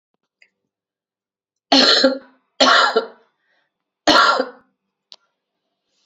{"three_cough_length": "6.1 s", "three_cough_amplitude": 32507, "three_cough_signal_mean_std_ratio": 0.36, "survey_phase": "beta (2021-08-13 to 2022-03-07)", "age": "45-64", "gender": "Female", "wearing_mask": "No", "symptom_new_continuous_cough": true, "symptom_fatigue": true, "symptom_headache": true, "symptom_onset": "2 days", "smoker_status": "Never smoked", "respiratory_condition_asthma": false, "respiratory_condition_other": false, "recruitment_source": "Test and Trace", "submission_delay": "1 day", "covid_test_result": "Positive", "covid_test_method": "RT-qPCR", "covid_ct_value": 15.8, "covid_ct_gene": "ORF1ab gene", "covid_ct_mean": 15.9, "covid_viral_load": "5900000 copies/ml", "covid_viral_load_category": "High viral load (>1M copies/ml)"}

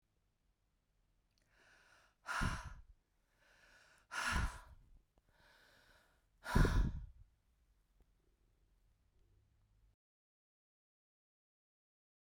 {"exhalation_length": "12.3 s", "exhalation_amplitude": 4508, "exhalation_signal_mean_std_ratio": 0.26, "survey_phase": "beta (2021-08-13 to 2022-03-07)", "age": "45-64", "gender": "Female", "wearing_mask": "No", "symptom_runny_or_blocked_nose": true, "smoker_status": "Never smoked", "respiratory_condition_asthma": false, "respiratory_condition_other": false, "recruitment_source": "REACT", "submission_delay": "2 days", "covid_test_result": "Negative", "covid_test_method": "RT-qPCR", "influenza_a_test_result": "Negative", "influenza_b_test_result": "Negative"}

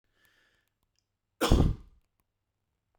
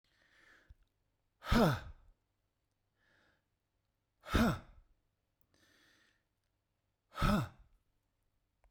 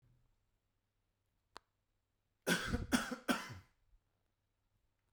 {"cough_length": "3.0 s", "cough_amplitude": 13380, "cough_signal_mean_std_ratio": 0.25, "exhalation_length": "8.7 s", "exhalation_amplitude": 4434, "exhalation_signal_mean_std_ratio": 0.26, "three_cough_length": "5.1 s", "three_cough_amplitude": 4260, "three_cough_signal_mean_std_ratio": 0.29, "survey_phase": "beta (2021-08-13 to 2022-03-07)", "age": "45-64", "gender": "Male", "wearing_mask": "No", "symptom_none": true, "smoker_status": "Current smoker (1 to 10 cigarettes per day)", "respiratory_condition_asthma": false, "respiratory_condition_other": false, "recruitment_source": "REACT", "submission_delay": "2 days", "covid_test_result": "Negative", "covid_test_method": "RT-qPCR"}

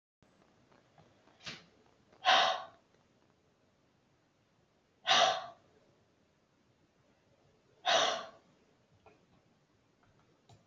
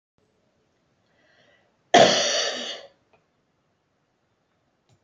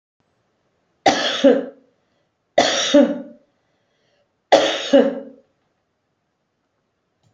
{"exhalation_length": "10.7 s", "exhalation_amplitude": 6912, "exhalation_signal_mean_std_ratio": 0.27, "cough_length": "5.0 s", "cough_amplitude": 27767, "cough_signal_mean_std_ratio": 0.26, "three_cough_length": "7.3 s", "three_cough_amplitude": 29089, "three_cough_signal_mean_std_ratio": 0.35, "survey_phase": "alpha (2021-03-01 to 2021-08-12)", "age": "65+", "gender": "Female", "wearing_mask": "No", "symptom_none": true, "smoker_status": "Never smoked", "respiratory_condition_asthma": false, "respiratory_condition_other": false, "recruitment_source": "REACT", "submission_delay": "3 days", "covid_test_result": "Negative", "covid_test_method": "RT-qPCR"}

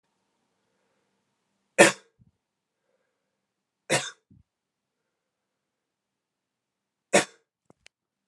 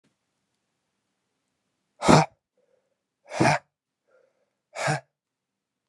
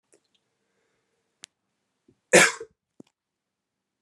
{"three_cough_length": "8.3 s", "three_cough_amplitude": 29487, "three_cough_signal_mean_std_ratio": 0.15, "exhalation_length": "5.9 s", "exhalation_amplitude": 30684, "exhalation_signal_mean_std_ratio": 0.23, "cough_length": "4.0 s", "cough_amplitude": 25659, "cough_signal_mean_std_ratio": 0.17, "survey_phase": "alpha (2021-03-01 to 2021-08-12)", "age": "18-44", "gender": "Male", "wearing_mask": "No", "symptom_fatigue": true, "symptom_change_to_sense_of_smell_or_taste": true, "symptom_loss_of_taste": true, "smoker_status": "Never smoked", "respiratory_condition_asthma": false, "respiratory_condition_other": false, "recruitment_source": "Test and Trace", "submission_delay": "2 days", "covid_test_result": "Positive", "covid_test_method": "RT-qPCR", "covid_ct_value": 18.8, "covid_ct_gene": "ORF1ab gene", "covid_ct_mean": 19.4, "covid_viral_load": "440000 copies/ml", "covid_viral_load_category": "Low viral load (10K-1M copies/ml)"}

